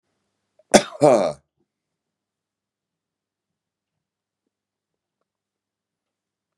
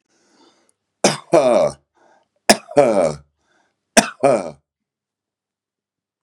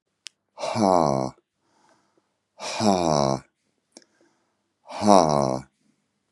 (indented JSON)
{
  "cough_length": "6.6 s",
  "cough_amplitude": 32768,
  "cough_signal_mean_std_ratio": 0.17,
  "three_cough_length": "6.2 s",
  "three_cough_amplitude": 32768,
  "three_cough_signal_mean_std_ratio": 0.34,
  "exhalation_length": "6.3 s",
  "exhalation_amplitude": 29335,
  "exhalation_signal_mean_std_ratio": 0.36,
  "survey_phase": "beta (2021-08-13 to 2022-03-07)",
  "age": "65+",
  "gender": "Male",
  "wearing_mask": "No",
  "symptom_sore_throat": true,
  "symptom_onset": "3 days",
  "smoker_status": "Ex-smoker",
  "respiratory_condition_asthma": false,
  "respiratory_condition_other": false,
  "recruitment_source": "Test and Trace",
  "submission_delay": "1 day",
  "covid_test_result": "Positive",
  "covid_test_method": "ePCR"
}